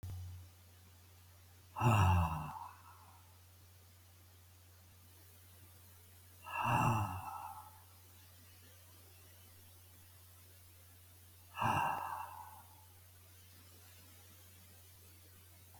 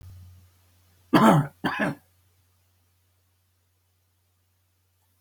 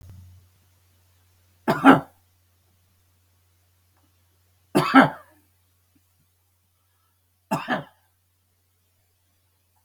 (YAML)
exhalation_length: 15.8 s
exhalation_amplitude: 3766
exhalation_signal_mean_std_ratio: 0.4
cough_length: 5.2 s
cough_amplitude: 19610
cough_signal_mean_std_ratio: 0.26
three_cough_length: 9.8 s
three_cough_amplitude: 31977
three_cough_signal_mean_std_ratio: 0.2
survey_phase: beta (2021-08-13 to 2022-03-07)
age: 65+
gender: Male
wearing_mask: 'No'
symptom_runny_or_blocked_nose: true
symptom_sore_throat: true
smoker_status: Never smoked
respiratory_condition_asthma: false
respiratory_condition_other: true
recruitment_source: Test and Trace
submission_delay: 2 days
covid_test_result: Positive
covid_test_method: RT-qPCR
covid_ct_value: 29.0
covid_ct_gene: ORF1ab gene
covid_ct_mean: 29.4
covid_viral_load: 230 copies/ml
covid_viral_load_category: Minimal viral load (< 10K copies/ml)